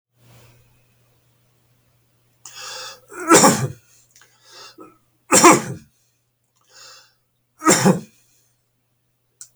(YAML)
three_cough_length: 9.6 s
three_cough_amplitude: 32768
three_cough_signal_mean_std_ratio: 0.27
survey_phase: beta (2021-08-13 to 2022-03-07)
age: 65+
gender: Male
wearing_mask: 'No'
symptom_none: true
smoker_status: Never smoked
respiratory_condition_asthma: false
respiratory_condition_other: false
recruitment_source: REACT
submission_delay: 0 days
covid_test_result: Negative
covid_test_method: RT-qPCR